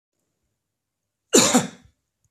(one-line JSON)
{"cough_length": "2.3 s", "cough_amplitude": 29031, "cough_signal_mean_std_ratio": 0.28, "survey_phase": "beta (2021-08-13 to 2022-03-07)", "age": "45-64", "gender": "Male", "wearing_mask": "No", "symptom_none": true, "smoker_status": "Never smoked", "respiratory_condition_asthma": false, "respiratory_condition_other": false, "recruitment_source": "REACT", "submission_delay": "2 days", "covid_test_result": "Negative", "covid_test_method": "RT-qPCR"}